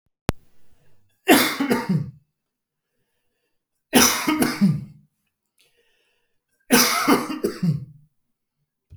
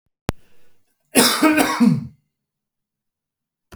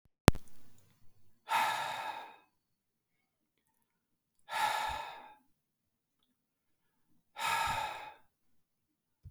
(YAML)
three_cough_length: 9.0 s
three_cough_amplitude: 30591
three_cough_signal_mean_std_ratio: 0.41
cough_length: 3.8 s
cough_amplitude: 32768
cough_signal_mean_std_ratio: 0.39
exhalation_length: 9.3 s
exhalation_amplitude: 27275
exhalation_signal_mean_std_ratio: 0.34
survey_phase: beta (2021-08-13 to 2022-03-07)
age: 45-64
gender: Male
wearing_mask: 'No'
symptom_none: true
smoker_status: Never smoked
respiratory_condition_asthma: false
respiratory_condition_other: false
recruitment_source: REACT
submission_delay: 2 days
covid_test_result: Negative
covid_test_method: RT-qPCR
influenza_a_test_result: Negative
influenza_b_test_result: Negative